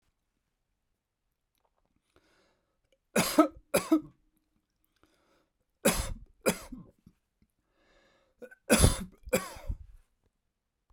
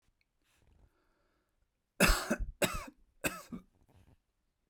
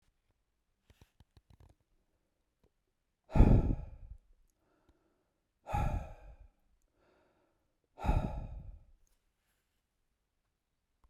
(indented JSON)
{
  "three_cough_length": "10.9 s",
  "three_cough_amplitude": 16168,
  "three_cough_signal_mean_std_ratio": 0.26,
  "cough_length": "4.7 s",
  "cough_amplitude": 8466,
  "cough_signal_mean_std_ratio": 0.29,
  "exhalation_length": "11.1 s",
  "exhalation_amplitude": 11844,
  "exhalation_signal_mean_std_ratio": 0.24,
  "survey_phase": "beta (2021-08-13 to 2022-03-07)",
  "age": "65+",
  "gender": "Male",
  "wearing_mask": "No",
  "symptom_none": true,
  "smoker_status": "Never smoked",
  "respiratory_condition_asthma": false,
  "respiratory_condition_other": false,
  "recruitment_source": "REACT",
  "submission_delay": "1 day",
  "covid_test_result": "Negative",
  "covid_test_method": "RT-qPCR"
}